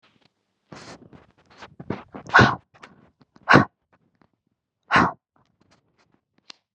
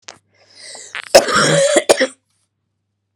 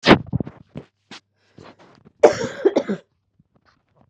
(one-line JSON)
{"exhalation_length": "6.7 s", "exhalation_amplitude": 31235, "exhalation_signal_mean_std_ratio": 0.23, "cough_length": "3.2 s", "cough_amplitude": 32768, "cough_signal_mean_std_ratio": 0.41, "three_cough_length": "4.1 s", "three_cough_amplitude": 32768, "three_cough_signal_mean_std_ratio": 0.28, "survey_phase": "beta (2021-08-13 to 2022-03-07)", "age": "18-44", "gender": "Female", "wearing_mask": "No", "symptom_cough_any": true, "symptom_runny_or_blocked_nose": true, "symptom_diarrhoea": true, "symptom_fatigue": true, "symptom_headache": true, "smoker_status": "Ex-smoker", "respiratory_condition_asthma": true, "respiratory_condition_other": false, "recruitment_source": "Test and Trace", "submission_delay": "9 days", "covid_test_result": "Negative", "covid_test_method": "RT-qPCR"}